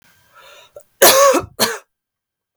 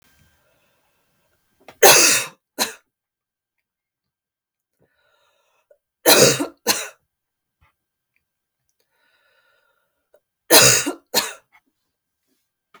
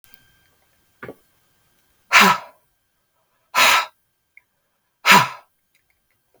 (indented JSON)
{
  "cough_length": "2.6 s",
  "cough_amplitude": 32768,
  "cough_signal_mean_std_ratio": 0.38,
  "three_cough_length": "12.8 s",
  "three_cough_amplitude": 32768,
  "three_cough_signal_mean_std_ratio": 0.26,
  "exhalation_length": "6.4 s",
  "exhalation_amplitude": 32768,
  "exhalation_signal_mean_std_ratio": 0.27,
  "survey_phase": "beta (2021-08-13 to 2022-03-07)",
  "age": "18-44",
  "gender": "Female",
  "wearing_mask": "No",
  "symptom_none": true,
  "smoker_status": "Never smoked",
  "respiratory_condition_asthma": true,
  "respiratory_condition_other": false,
  "recruitment_source": "REACT",
  "submission_delay": "2 days",
  "covid_test_result": "Negative",
  "covid_test_method": "RT-qPCR",
  "influenza_a_test_result": "Negative",
  "influenza_b_test_result": "Negative"
}